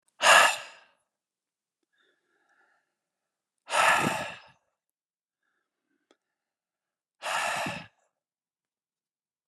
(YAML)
exhalation_length: 9.5 s
exhalation_amplitude: 20232
exhalation_signal_mean_std_ratio: 0.27
survey_phase: beta (2021-08-13 to 2022-03-07)
age: 45-64
gender: Male
wearing_mask: 'No'
symptom_none: true
symptom_onset: 12 days
smoker_status: Never smoked
respiratory_condition_asthma: false
respiratory_condition_other: false
recruitment_source: REACT
submission_delay: 2 days
covid_test_result: Negative
covid_test_method: RT-qPCR
influenza_a_test_result: Negative
influenza_b_test_result: Negative